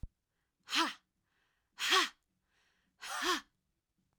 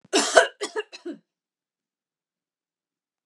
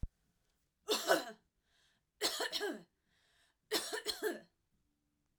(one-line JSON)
{"exhalation_length": "4.2 s", "exhalation_amplitude": 6819, "exhalation_signal_mean_std_ratio": 0.34, "cough_length": "3.3 s", "cough_amplitude": 32767, "cough_signal_mean_std_ratio": 0.25, "three_cough_length": "5.4 s", "three_cough_amplitude": 5332, "three_cough_signal_mean_std_ratio": 0.39, "survey_phase": "alpha (2021-03-01 to 2021-08-12)", "age": "18-44", "gender": "Female", "wearing_mask": "No", "symptom_cough_any": true, "smoker_status": "Never smoked", "respiratory_condition_asthma": false, "respiratory_condition_other": false, "recruitment_source": "REACT", "submission_delay": "3 days", "covid_test_result": "Negative", "covid_test_method": "RT-qPCR"}